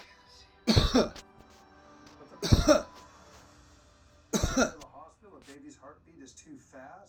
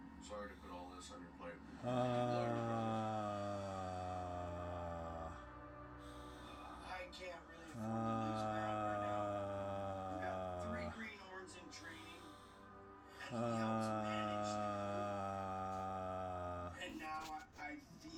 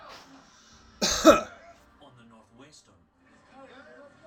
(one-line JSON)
{"three_cough_length": "7.1 s", "three_cough_amplitude": 14825, "three_cough_signal_mean_std_ratio": 0.34, "exhalation_length": "18.2 s", "exhalation_amplitude": 1583, "exhalation_signal_mean_std_ratio": 0.93, "cough_length": "4.3 s", "cough_amplitude": 22671, "cough_signal_mean_std_ratio": 0.23, "survey_phase": "alpha (2021-03-01 to 2021-08-12)", "age": "45-64", "gender": "Male", "wearing_mask": "No", "symptom_none": true, "smoker_status": "Never smoked", "respiratory_condition_asthma": false, "respiratory_condition_other": false, "recruitment_source": "REACT", "submission_delay": "1 day", "covid_test_result": "Negative", "covid_test_method": "RT-qPCR"}